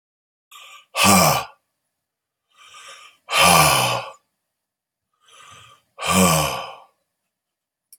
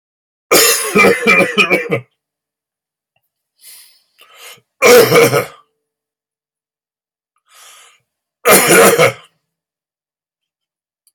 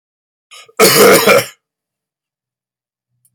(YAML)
exhalation_length: 8.0 s
exhalation_amplitude: 32713
exhalation_signal_mean_std_ratio: 0.39
three_cough_length: 11.1 s
three_cough_amplitude: 32768
three_cough_signal_mean_std_ratio: 0.4
cough_length: 3.3 s
cough_amplitude: 32768
cough_signal_mean_std_ratio: 0.38
survey_phase: beta (2021-08-13 to 2022-03-07)
age: 45-64
gender: Male
wearing_mask: 'No'
symptom_cough_any: true
symptom_shortness_of_breath: true
symptom_fatigue: true
symptom_onset: 3 days
smoker_status: Never smoked
respiratory_condition_asthma: false
respiratory_condition_other: false
recruitment_source: Test and Trace
submission_delay: 2 days
covid_test_result: Positive
covid_test_method: RT-qPCR
covid_ct_value: 22.9
covid_ct_gene: ORF1ab gene